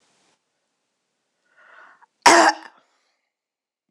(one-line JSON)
{"cough_length": "3.9 s", "cough_amplitude": 26028, "cough_signal_mean_std_ratio": 0.21, "survey_phase": "beta (2021-08-13 to 2022-03-07)", "age": "45-64", "gender": "Female", "wearing_mask": "No", "symptom_cough_any": true, "symptom_runny_or_blocked_nose": true, "symptom_onset": "7 days", "smoker_status": "Never smoked", "respiratory_condition_asthma": false, "respiratory_condition_other": false, "recruitment_source": "Test and Trace", "submission_delay": "1 day", "covid_test_result": "Positive", "covid_test_method": "ePCR"}